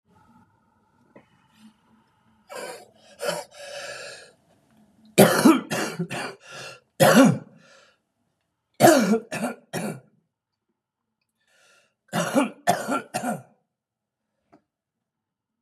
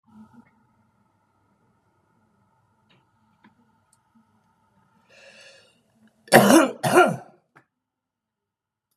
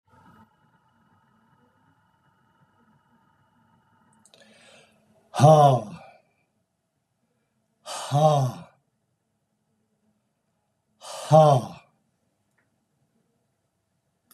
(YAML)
three_cough_length: 15.6 s
three_cough_amplitude: 31428
three_cough_signal_mean_std_ratio: 0.32
cough_length: 9.0 s
cough_amplitude: 32767
cough_signal_mean_std_ratio: 0.22
exhalation_length: 14.3 s
exhalation_amplitude: 24342
exhalation_signal_mean_std_ratio: 0.24
survey_phase: beta (2021-08-13 to 2022-03-07)
age: 65+
gender: Male
wearing_mask: 'No'
symptom_cough_any: true
symptom_runny_or_blocked_nose: true
symptom_fatigue: true
symptom_onset: 4 days
smoker_status: Current smoker (1 to 10 cigarettes per day)
respiratory_condition_asthma: false
respiratory_condition_other: true
recruitment_source: Test and Trace
submission_delay: 2 days
covid_test_result: Positive
covid_test_method: RT-qPCR
covid_ct_value: 15.7
covid_ct_gene: ORF1ab gene
covid_ct_mean: 15.9
covid_viral_load: 6100000 copies/ml
covid_viral_load_category: High viral load (>1M copies/ml)